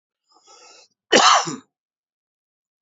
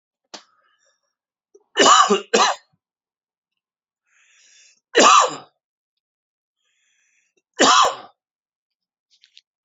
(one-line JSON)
{"cough_length": "2.8 s", "cough_amplitude": 28771, "cough_signal_mean_std_ratio": 0.29, "three_cough_length": "9.6 s", "three_cough_amplitude": 28894, "three_cough_signal_mean_std_ratio": 0.3, "survey_phase": "beta (2021-08-13 to 2022-03-07)", "age": "45-64", "gender": "Male", "wearing_mask": "No", "symptom_cough_any": true, "symptom_runny_or_blocked_nose": true, "symptom_shortness_of_breath": true, "symptom_fatigue": true, "symptom_headache": true, "symptom_change_to_sense_of_smell_or_taste": true, "smoker_status": "Never smoked", "respiratory_condition_asthma": false, "respiratory_condition_other": false, "recruitment_source": "Test and Trace", "submission_delay": "2 days", "covid_test_result": "Positive", "covid_test_method": "RT-qPCR", "covid_ct_value": 16.6, "covid_ct_gene": "ORF1ab gene", "covid_ct_mean": 17.2, "covid_viral_load": "2400000 copies/ml", "covid_viral_load_category": "High viral load (>1M copies/ml)"}